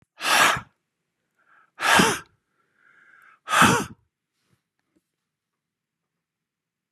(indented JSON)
{
  "exhalation_length": "6.9 s",
  "exhalation_amplitude": 24942,
  "exhalation_signal_mean_std_ratio": 0.31,
  "survey_phase": "beta (2021-08-13 to 2022-03-07)",
  "age": "45-64",
  "gender": "Male",
  "wearing_mask": "No",
  "symptom_fatigue": true,
  "symptom_onset": "5 days",
  "smoker_status": "Never smoked",
  "respiratory_condition_asthma": false,
  "respiratory_condition_other": false,
  "recruitment_source": "REACT",
  "submission_delay": "0 days",
  "covid_test_result": "Negative",
  "covid_test_method": "RT-qPCR",
  "influenza_a_test_result": "Negative",
  "influenza_b_test_result": "Negative"
}